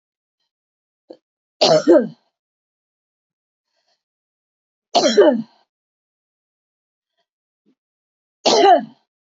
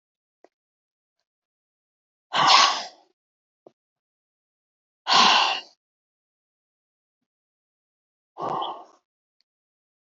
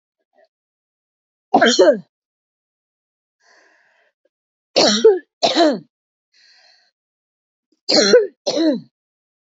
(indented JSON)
{
  "three_cough_length": "9.3 s",
  "three_cough_amplitude": 27929,
  "three_cough_signal_mean_std_ratio": 0.29,
  "exhalation_length": "10.1 s",
  "exhalation_amplitude": 25065,
  "exhalation_signal_mean_std_ratio": 0.26,
  "cough_length": "9.6 s",
  "cough_amplitude": 29096,
  "cough_signal_mean_std_ratio": 0.35,
  "survey_phase": "alpha (2021-03-01 to 2021-08-12)",
  "age": "45-64",
  "gender": "Female",
  "wearing_mask": "No",
  "symptom_none": true,
  "smoker_status": "Never smoked",
  "respiratory_condition_asthma": true,
  "respiratory_condition_other": false,
  "recruitment_source": "REACT",
  "submission_delay": "1 day",
  "covid_test_result": "Negative",
  "covid_test_method": "RT-qPCR"
}